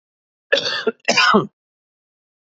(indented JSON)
{
  "cough_length": "2.6 s",
  "cough_amplitude": 27587,
  "cough_signal_mean_std_ratio": 0.4,
  "survey_phase": "beta (2021-08-13 to 2022-03-07)",
  "age": "45-64",
  "gender": "Male",
  "wearing_mask": "No",
  "symptom_cough_any": true,
  "symptom_sore_throat": true,
  "symptom_fatigue": true,
  "symptom_headache": true,
  "symptom_onset": "7 days",
  "smoker_status": "Never smoked",
  "respiratory_condition_asthma": true,
  "respiratory_condition_other": false,
  "recruitment_source": "REACT",
  "submission_delay": "2 days",
  "covid_test_result": "Positive",
  "covid_test_method": "RT-qPCR",
  "covid_ct_value": 35.0,
  "covid_ct_gene": "N gene",
  "influenza_a_test_result": "Negative",
  "influenza_b_test_result": "Negative"
}